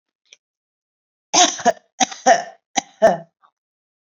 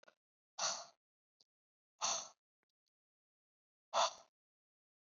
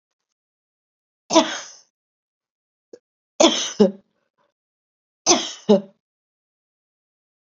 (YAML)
cough_length: 4.2 s
cough_amplitude: 30408
cough_signal_mean_std_ratio: 0.31
exhalation_length: 5.1 s
exhalation_amplitude: 2681
exhalation_signal_mean_std_ratio: 0.26
three_cough_length: 7.4 s
three_cough_amplitude: 31311
three_cough_signal_mean_std_ratio: 0.25
survey_phase: beta (2021-08-13 to 2022-03-07)
age: 18-44
gender: Female
wearing_mask: 'No'
symptom_none: true
smoker_status: Never smoked
respiratory_condition_asthma: false
respiratory_condition_other: false
recruitment_source: Test and Trace
submission_delay: 1 day
covid_test_result: Negative
covid_test_method: ePCR